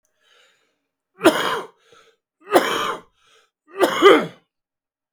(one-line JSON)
{"three_cough_length": "5.1 s", "three_cough_amplitude": 32766, "three_cough_signal_mean_std_ratio": 0.35, "survey_phase": "beta (2021-08-13 to 2022-03-07)", "age": "45-64", "gender": "Male", "wearing_mask": "No", "symptom_cough_any": true, "symptom_runny_or_blocked_nose": true, "symptom_shortness_of_breath": true, "symptom_diarrhoea": true, "symptom_fatigue": true, "symptom_other": true, "smoker_status": "Ex-smoker", "respiratory_condition_asthma": true, "respiratory_condition_other": false, "recruitment_source": "Test and Trace", "submission_delay": "2 days", "covid_test_result": "Positive", "covid_test_method": "LFT"}